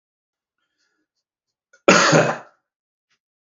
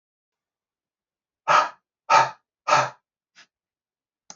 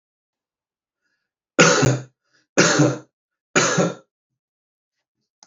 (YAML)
cough_length: 3.5 s
cough_amplitude: 32768
cough_signal_mean_std_ratio: 0.28
exhalation_length: 4.4 s
exhalation_amplitude: 22574
exhalation_signal_mean_std_ratio: 0.28
three_cough_length: 5.5 s
three_cough_amplitude: 32766
three_cough_signal_mean_std_ratio: 0.36
survey_phase: beta (2021-08-13 to 2022-03-07)
age: 18-44
gender: Male
wearing_mask: 'No'
symptom_none: true
smoker_status: Never smoked
respiratory_condition_asthma: false
respiratory_condition_other: false
recruitment_source: REACT
submission_delay: 2 days
covid_test_result: Negative
covid_test_method: RT-qPCR
covid_ct_value: 43.0
covid_ct_gene: N gene